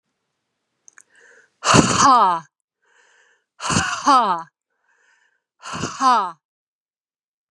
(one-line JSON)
{"exhalation_length": "7.5 s", "exhalation_amplitude": 32767, "exhalation_signal_mean_std_ratio": 0.38, "survey_phase": "beta (2021-08-13 to 2022-03-07)", "age": "45-64", "gender": "Female", "wearing_mask": "No", "symptom_cough_any": true, "symptom_headache": true, "smoker_status": "Never smoked", "respiratory_condition_asthma": false, "respiratory_condition_other": false, "recruitment_source": "REACT", "submission_delay": "1 day", "covid_test_result": "Negative", "covid_test_method": "RT-qPCR", "influenza_a_test_result": "Negative", "influenza_b_test_result": "Negative"}